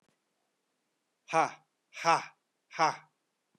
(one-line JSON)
{"exhalation_length": "3.6 s", "exhalation_amplitude": 8137, "exhalation_signal_mean_std_ratio": 0.28, "survey_phase": "beta (2021-08-13 to 2022-03-07)", "age": "45-64", "gender": "Male", "wearing_mask": "No", "symptom_none": true, "smoker_status": "Never smoked", "respiratory_condition_asthma": false, "respiratory_condition_other": false, "recruitment_source": "REACT", "submission_delay": "1 day", "covid_test_result": "Negative", "covid_test_method": "RT-qPCR", "influenza_a_test_result": "Negative", "influenza_b_test_result": "Negative"}